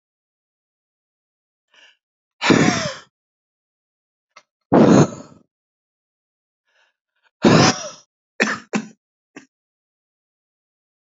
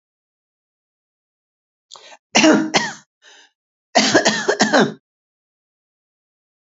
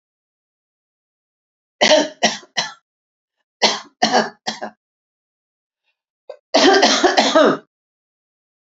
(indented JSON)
{
  "exhalation_length": "11.0 s",
  "exhalation_amplitude": 32768,
  "exhalation_signal_mean_std_ratio": 0.27,
  "cough_length": "6.7 s",
  "cough_amplitude": 32565,
  "cough_signal_mean_std_ratio": 0.34,
  "three_cough_length": "8.8 s",
  "three_cough_amplitude": 32768,
  "three_cough_signal_mean_std_ratio": 0.37,
  "survey_phase": "alpha (2021-03-01 to 2021-08-12)",
  "age": "65+",
  "gender": "Male",
  "wearing_mask": "No",
  "symptom_none": true,
  "smoker_status": "Never smoked",
  "respiratory_condition_asthma": false,
  "respiratory_condition_other": false,
  "recruitment_source": "REACT",
  "submission_delay": "1 day",
  "covid_test_result": "Negative",
  "covid_test_method": "RT-qPCR"
}